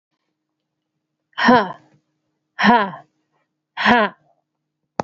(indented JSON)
{
  "exhalation_length": "5.0 s",
  "exhalation_amplitude": 28281,
  "exhalation_signal_mean_std_ratio": 0.32,
  "survey_phase": "alpha (2021-03-01 to 2021-08-12)",
  "age": "45-64",
  "gender": "Female",
  "wearing_mask": "No",
  "symptom_cough_any": true,
  "symptom_fatigue": true,
  "symptom_headache": true,
  "symptom_change_to_sense_of_smell_or_taste": true,
  "symptom_loss_of_taste": true,
  "symptom_onset": "5 days",
  "smoker_status": "Ex-smoker",
  "respiratory_condition_asthma": false,
  "respiratory_condition_other": false,
  "recruitment_source": "Test and Trace",
  "submission_delay": "1 day",
  "covid_test_result": "Positive",
  "covid_test_method": "RT-qPCR"
}